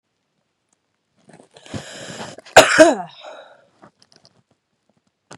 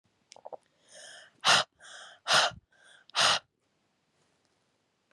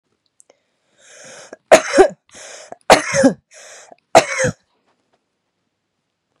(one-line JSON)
{"cough_length": "5.4 s", "cough_amplitude": 32768, "cough_signal_mean_std_ratio": 0.23, "exhalation_length": "5.1 s", "exhalation_amplitude": 10683, "exhalation_signal_mean_std_ratio": 0.3, "three_cough_length": "6.4 s", "three_cough_amplitude": 32768, "three_cough_signal_mean_std_ratio": 0.29, "survey_phase": "beta (2021-08-13 to 2022-03-07)", "age": "18-44", "gender": "Female", "wearing_mask": "No", "symptom_cough_any": true, "symptom_runny_or_blocked_nose": true, "symptom_fatigue": true, "symptom_headache": true, "symptom_change_to_sense_of_smell_or_taste": true, "smoker_status": "Ex-smoker", "respiratory_condition_asthma": false, "respiratory_condition_other": false, "recruitment_source": "Test and Trace", "submission_delay": "1 day", "covid_test_result": "Positive", "covid_test_method": "RT-qPCR"}